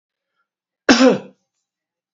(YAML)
cough_length: 2.1 s
cough_amplitude: 27923
cough_signal_mean_std_ratio: 0.29
survey_phase: beta (2021-08-13 to 2022-03-07)
age: 65+
gender: Male
wearing_mask: 'No'
symptom_cough_any: true
symptom_runny_or_blocked_nose: true
smoker_status: Never smoked
respiratory_condition_asthma: false
respiratory_condition_other: false
recruitment_source: Test and Trace
submission_delay: 2 days
covid_test_result: Positive
covid_test_method: RT-qPCR
covid_ct_value: 17.8
covid_ct_gene: ORF1ab gene
covid_ct_mean: 18.4
covid_viral_load: 920000 copies/ml
covid_viral_load_category: Low viral load (10K-1M copies/ml)